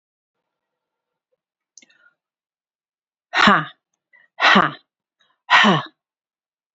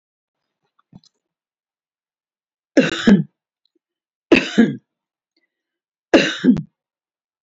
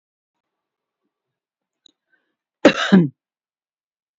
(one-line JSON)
{"exhalation_length": "6.7 s", "exhalation_amplitude": 31542, "exhalation_signal_mean_std_ratio": 0.28, "three_cough_length": "7.4 s", "three_cough_amplitude": 30629, "three_cough_signal_mean_std_ratio": 0.28, "cough_length": "4.2 s", "cough_amplitude": 32201, "cough_signal_mean_std_ratio": 0.21, "survey_phase": "beta (2021-08-13 to 2022-03-07)", "age": "45-64", "gender": "Female", "wearing_mask": "No", "symptom_none": true, "smoker_status": "Never smoked", "respiratory_condition_asthma": false, "respiratory_condition_other": false, "recruitment_source": "REACT", "submission_delay": "11 days", "covid_test_result": "Negative", "covid_test_method": "RT-qPCR"}